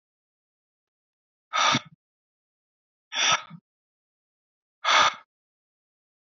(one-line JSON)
{"exhalation_length": "6.3 s", "exhalation_amplitude": 14474, "exhalation_signal_mean_std_ratio": 0.28, "survey_phase": "beta (2021-08-13 to 2022-03-07)", "age": "18-44", "gender": "Male", "wearing_mask": "No", "symptom_none": true, "symptom_onset": "5 days", "smoker_status": "Never smoked", "respiratory_condition_asthma": false, "respiratory_condition_other": true, "recruitment_source": "REACT", "submission_delay": "1 day", "covid_test_result": "Negative", "covid_test_method": "RT-qPCR", "influenza_a_test_result": "Negative", "influenza_b_test_result": "Negative"}